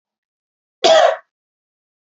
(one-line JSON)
{"cough_length": "2.0 s", "cough_amplitude": 29828, "cough_signal_mean_std_ratio": 0.32, "survey_phase": "beta (2021-08-13 to 2022-03-07)", "age": "18-44", "gender": "Female", "wearing_mask": "No", "symptom_none": true, "smoker_status": "Ex-smoker", "respiratory_condition_asthma": false, "respiratory_condition_other": false, "recruitment_source": "REACT", "submission_delay": "1 day", "covid_test_result": "Negative", "covid_test_method": "RT-qPCR"}